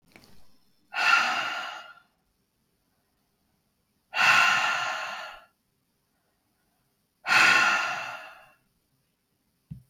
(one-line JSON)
{"exhalation_length": "9.9 s", "exhalation_amplitude": 17338, "exhalation_signal_mean_std_ratio": 0.41, "survey_phase": "beta (2021-08-13 to 2022-03-07)", "age": "45-64", "gender": "Female", "wearing_mask": "No", "symptom_none": true, "smoker_status": "Never smoked", "respiratory_condition_asthma": false, "respiratory_condition_other": false, "recruitment_source": "REACT", "submission_delay": "3 days", "covid_test_result": "Negative", "covid_test_method": "RT-qPCR", "influenza_a_test_result": "Negative", "influenza_b_test_result": "Negative"}